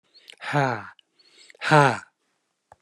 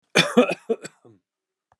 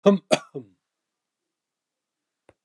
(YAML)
exhalation_length: 2.8 s
exhalation_amplitude: 23739
exhalation_signal_mean_std_ratio: 0.35
cough_length: 1.8 s
cough_amplitude: 30850
cough_signal_mean_std_ratio: 0.33
three_cough_length: 2.6 s
three_cough_amplitude: 23515
three_cough_signal_mean_std_ratio: 0.21
survey_phase: beta (2021-08-13 to 2022-03-07)
age: 65+
gender: Male
wearing_mask: 'No'
symptom_none: true
smoker_status: Never smoked
respiratory_condition_asthma: false
respiratory_condition_other: false
recruitment_source: REACT
submission_delay: 1 day
covid_test_result: Negative
covid_test_method: RT-qPCR